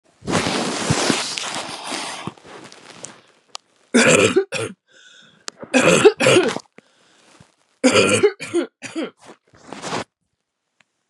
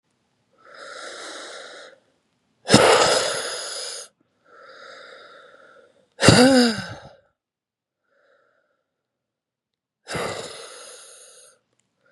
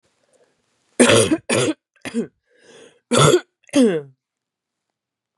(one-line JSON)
{"three_cough_length": "11.1 s", "three_cough_amplitude": 32323, "three_cough_signal_mean_std_ratio": 0.46, "exhalation_length": "12.1 s", "exhalation_amplitude": 32768, "exhalation_signal_mean_std_ratio": 0.32, "cough_length": "5.4 s", "cough_amplitude": 32307, "cough_signal_mean_std_ratio": 0.39, "survey_phase": "beta (2021-08-13 to 2022-03-07)", "age": "45-64", "gender": "Female", "wearing_mask": "No", "symptom_cough_any": true, "symptom_runny_or_blocked_nose": true, "symptom_sore_throat": true, "symptom_other": true, "symptom_onset": "3 days", "smoker_status": "Current smoker (e-cigarettes or vapes only)", "respiratory_condition_asthma": false, "respiratory_condition_other": false, "recruitment_source": "Test and Trace", "submission_delay": "2 days", "covid_test_result": "Positive", "covid_test_method": "ePCR"}